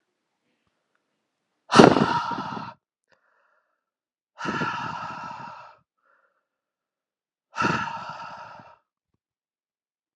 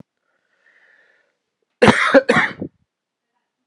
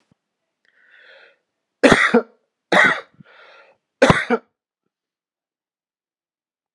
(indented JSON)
{
  "exhalation_length": "10.2 s",
  "exhalation_amplitude": 32768,
  "exhalation_signal_mean_std_ratio": 0.26,
  "cough_length": "3.7 s",
  "cough_amplitude": 32768,
  "cough_signal_mean_std_ratio": 0.3,
  "three_cough_length": "6.7 s",
  "three_cough_amplitude": 32768,
  "three_cough_signal_mean_std_ratio": 0.28,
  "survey_phase": "beta (2021-08-13 to 2022-03-07)",
  "age": "45-64",
  "gender": "Male",
  "wearing_mask": "No",
  "symptom_cough_any": true,
  "symptom_runny_or_blocked_nose": true,
  "symptom_sore_throat": true,
  "smoker_status": "Never smoked",
  "respiratory_condition_asthma": false,
  "respiratory_condition_other": false,
  "recruitment_source": "Test and Trace",
  "submission_delay": "1 day",
  "covid_test_result": "Positive",
  "covid_test_method": "RT-qPCR"
}